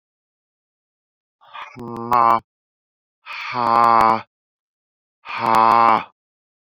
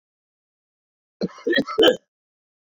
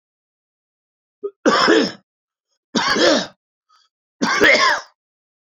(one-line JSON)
{"exhalation_length": "6.7 s", "exhalation_amplitude": 29158, "exhalation_signal_mean_std_ratio": 0.38, "cough_length": "2.7 s", "cough_amplitude": 24389, "cough_signal_mean_std_ratio": 0.31, "three_cough_length": "5.5 s", "three_cough_amplitude": 27387, "three_cough_signal_mean_std_ratio": 0.44, "survey_phase": "beta (2021-08-13 to 2022-03-07)", "age": "45-64", "gender": "Male", "wearing_mask": "No", "symptom_none": true, "smoker_status": "Never smoked", "respiratory_condition_asthma": false, "respiratory_condition_other": false, "recruitment_source": "REACT", "submission_delay": "1 day", "covid_test_result": "Negative", "covid_test_method": "RT-qPCR"}